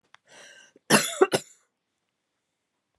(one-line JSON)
{"cough_length": "3.0 s", "cough_amplitude": 22462, "cough_signal_mean_std_ratio": 0.24, "survey_phase": "beta (2021-08-13 to 2022-03-07)", "age": "45-64", "gender": "Female", "wearing_mask": "No", "symptom_cough_any": true, "symptom_runny_or_blocked_nose": true, "symptom_abdominal_pain": true, "symptom_fatigue": true, "symptom_fever_high_temperature": true, "symptom_headache": true, "symptom_other": true, "smoker_status": "Never smoked", "respiratory_condition_asthma": false, "respiratory_condition_other": false, "recruitment_source": "Test and Trace", "submission_delay": "1 day", "covid_test_result": "Positive", "covid_test_method": "RT-qPCR"}